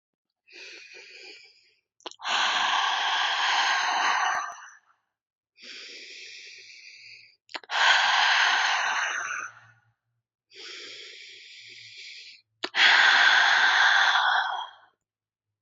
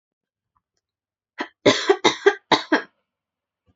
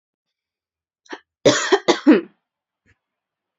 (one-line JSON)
{"exhalation_length": "15.6 s", "exhalation_amplitude": 15544, "exhalation_signal_mean_std_ratio": 0.56, "three_cough_length": "3.8 s", "three_cough_amplitude": 31438, "three_cough_signal_mean_std_ratio": 0.3, "cough_length": "3.6 s", "cough_amplitude": 32768, "cough_signal_mean_std_ratio": 0.29, "survey_phase": "beta (2021-08-13 to 2022-03-07)", "age": "18-44", "gender": "Female", "wearing_mask": "No", "symptom_runny_or_blocked_nose": true, "symptom_shortness_of_breath": true, "symptom_sore_throat": true, "symptom_fatigue": true, "symptom_fever_high_temperature": true, "symptom_headache": true, "symptom_onset": "7 days", "smoker_status": "Never smoked", "respiratory_condition_asthma": false, "respiratory_condition_other": false, "recruitment_source": "Test and Trace", "submission_delay": "4 days", "covid_test_result": "Positive", "covid_test_method": "RT-qPCR", "covid_ct_value": 21.2, "covid_ct_gene": "ORF1ab gene", "covid_ct_mean": 21.4, "covid_viral_load": "95000 copies/ml", "covid_viral_load_category": "Low viral load (10K-1M copies/ml)"}